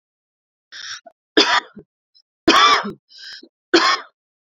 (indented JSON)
{
  "three_cough_length": "4.5 s",
  "three_cough_amplitude": 32767,
  "three_cough_signal_mean_std_ratio": 0.37,
  "survey_phase": "beta (2021-08-13 to 2022-03-07)",
  "age": "18-44",
  "gender": "Female",
  "wearing_mask": "No",
  "symptom_cough_any": true,
  "symptom_loss_of_taste": true,
  "symptom_onset": "12 days",
  "smoker_status": "Never smoked",
  "respiratory_condition_asthma": false,
  "respiratory_condition_other": false,
  "recruitment_source": "REACT",
  "submission_delay": "1 day",
  "covid_test_result": "Negative",
  "covid_test_method": "RT-qPCR"
}